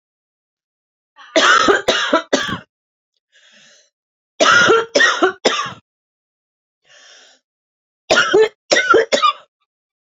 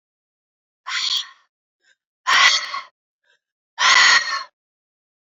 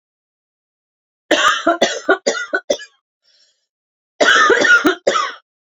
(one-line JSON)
{"three_cough_length": "10.2 s", "three_cough_amplitude": 31393, "three_cough_signal_mean_std_ratio": 0.44, "exhalation_length": "5.3 s", "exhalation_amplitude": 29935, "exhalation_signal_mean_std_ratio": 0.39, "cough_length": "5.7 s", "cough_amplitude": 29780, "cough_signal_mean_std_ratio": 0.47, "survey_phase": "beta (2021-08-13 to 2022-03-07)", "age": "18-44", "gender": "Female", "wearing_mask": "No", "symptom_cough_any": true, "symptom_new_continuous_cough": true, "symptom_runny_or_blocked_nose": true, "symptom_sore_throat": true, "symptom_fatigue": true, "symptom_headache": true, "symptom_other": true, "symptom_onset": "2 days", "smoker_status": "Never smoked", "respiratory_condition_asthma": false, "respiratory_condition_other": false, "recruitment_source": "Test and Trace", "submission_delay": "1 day", "covid_test_result": "Positive", "covid_test_method": "RT-qPCR", "covid_ct_value": 24.9, "covid_ct_gene": "ORF1ab gene"}